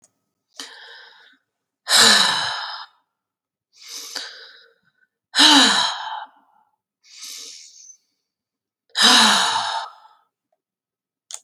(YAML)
exhalation_length: 11.4 s
exhalation_amplitude: 30904
exhalation_signal_mean_std_ratio: 0.37
survey_phase: beta (2021-08-13 to 2022-03-07)
age: 45-64
gender: Female
wearing_mask: 'No'
symptom_none: true
smoker_status: Ex-smoker
respiratory_condition_asthma: false
respiratory_condition_other: false
recruitment_source: REACT
submission_delay: 3 days
covid_test_result: Negative
covid_test_method: RT-qPCR
influenza_a_test_result: Negative
influenza_b_test_result: Negative